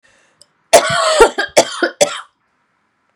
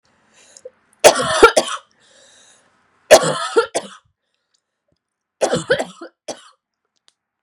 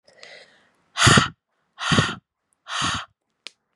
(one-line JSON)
{"cough_length": "3.2 s", "cough_amplitude": 32768, "cough_signal_mean_std_ratio": 0.42, "three_cough_length": "7.4 s", "three_cough_amplitude": 32768, "three_cough_signal_mean_std_ratio": 0.3, "exhalation_length": "3.8 s", "exhalation_amplitude": 29678, "exhalation_signal_mean_std_ratio": 0.36, "survey_phase": "beta (2021-08-13 to 2022-03-07)", "age": "18-44", "gender": "Female", "wearing_mask": "No", "symptom_cough_any": true, "symptom_runny_or_blocked_nose": true, "symptom_shortness_of_breath": true, "symptom_sore_throat": true, "symptom_fatigue": true, "symptom_fever_high_temperature": true, "symptom_headache": true, "smoker_status": "Never smoked", "respiratory_condition_asthma": false, "respiratory_condition_other": false, "recruitment_source": "Test and Trace", "submission_delay": "2 days", "covid_test_result": "Positive", "covid_test_method": "RT-qPCR", "covid_ct_value": 13.3, "covid_ct_gene": "ORF1ab gene"}